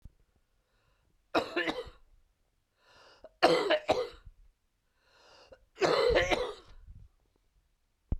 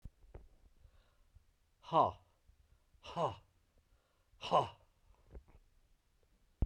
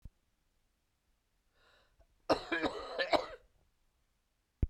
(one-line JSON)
{"three_cough_length": "8.2 s", "three_cough_amplitude": 11765, "three_cough_signal_mean_std_ratio": 0.37, "exhalation_length": "6.7 s", "exhalation_amplitude": 4625, "exhalation_signal_mean_std_ratio": 0.25, "cough_length": "4.7 s", "cough_amplitude": 7450, "cough_signal_mean_std_ratio": 0.29, "survey_phase": "beta (2021-08-13 to 2022-03-07)", "age": "45-64", "gender": "Male", "wearing_mask": "No", "symptom_cough_any": true, "symptom_sore_throat": true, "symptom_fatigue": true, "symptom_headache": true, "symptom_onset": "3 days", "smoker_status": "Never smoked", "respiratory_condition_asthma": false, "respiratory_condition_other": false, "recruitment_source": "Test and Trace", "submission_delay": "1 day", "covid_test_result": "Positive", "covid_test_method": "RT-qPCR"}